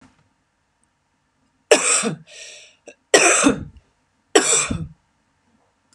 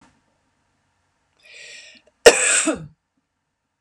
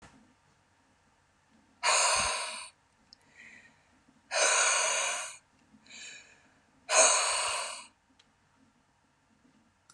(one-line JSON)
{"three_cough_length": "5.9 s", "three_cough_amplitude": 32767, "three_cough_signal_mean_std_ratio": 0.36, "cough_length": "3.8 s", "cough_amplitude": 32768, "cough_signal_mean_std_ratio": 0.24, "exhalation_length": "9.9 s", "exhalation_amplitude": 12452, "exhalation_signal_mean_std_ratio": 0.42, "survey_phase": "beta (2021-08-13 to 2022-03-07)", "age": "45-64", "gender": "Female", "wearing_mask": "No", "symptom_headache": true, "symptom_onset": "5 days", "smoker_status": "Never smoked", "respiratory_condition_asthma": false, "respiratory_condition_other": false, "recruitment_source": "REACT", "submission_delay": "1 day", "covid_test_result": "Negative", "covid_test_method": "RT-qPCR", "influenza_a_test_result": "Negative", "influenza_b_test_result": "Negative"}